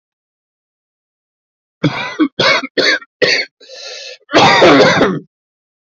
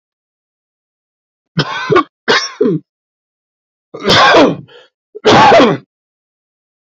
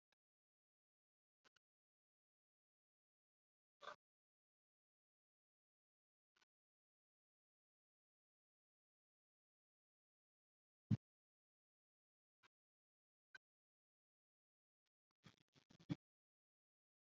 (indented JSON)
{
  "cough_length": "5.9 s",
  "cough_amplitude": 31468,
  "cough_signal_mean_std_ratio": 0.49,
  "three_cough_length": "6.8 s",
  "three_cough_amplitude": 31744,
  "three_cough_signal_mean_std_ratio": 0.44,
  "exhalation_length": "17.2 s",
  "exhalation_amplitude": 1335,
  "exhalation_signal_mean_std_ratio": 0.07,
  "survey_phase": "beta (2021-08-13 to 2022-03-07)",
  "age": "18-44",
  "gender": "Male",
  "wearing_mask": "No",
  "symptom_runny_or_blocked_nose": true,
  "symptom_sore_throat": true,
  "symptom_fatigue": true,
  "symptom_fever_high_temperature": true,
  "symptom_headache": true,
  "symptom_other": true,
  "symptom_onset": "4 days",
  "smoker_status": "Current smoker (e-cigarettes or vapes only)",
  "respiratory_condition_asthma": false,
  "respiratory_condition_other": false,
  "recruitment_source": "Test and Trace",
  "submission_delay": "2 days",
  "covid_test_result": "Positive",
  "covid_test_method": "RT-qPCR",
  "covid_ct_value": 34.6,
  "covid_ct_gene": "N gene"
}